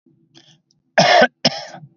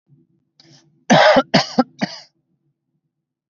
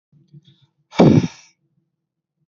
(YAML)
three_cough_length: 2.0 s
three_cough_amplitude: 30068
three_cough_signal_mean_std_ratio: 0.38
cough_length: 3.5 s
cough_amplitude: 28783
cough_signal_mean_std_ratio: 0.33
exhalation_length: 2.5 s
exhalation_amplitude: 32768
exhalation_signal_mean_std_ratio: 0.27
survey_phase: beta (2021-08-13 to 2022-03-07)
age: 45-64
gender: Male
wearing_mask: 'No'
symptom_none: true
smoker_status: Never smoked
respiratory_condition_asthma: false
respiratory_condition_other: false
recruitment_source: REACT
submission_delay: 1 day
covid_test_result: Negative
covid_test_method: RT-qPCR
influenza_a_test_result: Negative
influenza_b_test_result: Negative